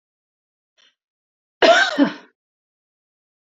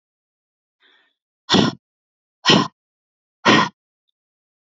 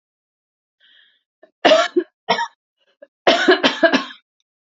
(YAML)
cough_length: 3.6 s
cough_amplitude: 28576
cough_signal_mean_std_ratio: 0.27
exhalation_length: 4.6 s
exhalation_amplitude: 28939
exhalation_signal_mean_std_ratio: 0.29
three_cough_length: 4.8 s
three_cough_amplitude: 29014
three_cough_signal_mean_std_ratio: 0.37
survey_phase: beta (2021-08-13 to 2022-03-07)
age: 18-44
gender: Female
wearing_mask: 'No'
symptom_runny_or_blocked_nose: true
smoker_status: Never smoked
respiratory_condition_asthma: false
respiratory_condition_other: false
recruitment_source: REACT
submission_delay: 1 day
covid_test_result: Negative
covid_test_method: RT-qPCR
influenza_a_test_result: Negative
influenza_b_test_result: Negative